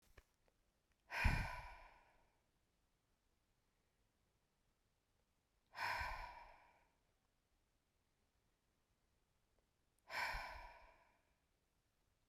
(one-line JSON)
{"exhalation_length": "12.3 s", "exhalation_amplitude": 2162, "exhalation_signal_mean_std_ratio": 0.28, "survey_phase": "beta (2021-08-13 to 2022-03-07)", "age": "45-64", "gender": "Female", "wearing_mask": "No", "symptom_cough_any": true, "smoker_status": "Ex-smoker", "respiratory_condition_asthma": false, "respiratory_condition_other": false, "recruitment_source": "REACT", "submission_delay": "1 day", "covid_test_result": "Negative", "covid_test_method": "RT-qPCR"}